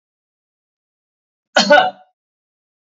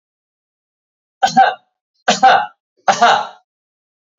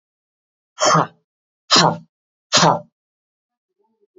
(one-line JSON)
{"cough_length": "2.9 s", "cough_amplitude": 29000, "cough_signal_mean_std_ratio": 0.26, "three_cough_length": "4.2 s", "three_cough_amplitude": 28464, "three_cough_signal_mean_std_ratio": 0.37, "exhalation_length": "4.2 s", "exhalation_amplitude": 31587, "exhalation_signal_mean_std_ratio": 0.33, "survey_phase": "beta (2021-08-13 to 2022-03-07)", "age": "45-64", "gender": "Male", "wearing_mask": "No", "symptom_none": true, "smoker_status": "Never smoked", "respiratory_condition_asthma": false, "respiratory_condition_other": false, "recruitment_source": "REACT", "submission_delay": "1 day", "covid_test_result": "Negative", "covid_test_method": "RT-qPCR", "influenza_a_test_result": "Negative", "influenza_b_test_result": "Negative"}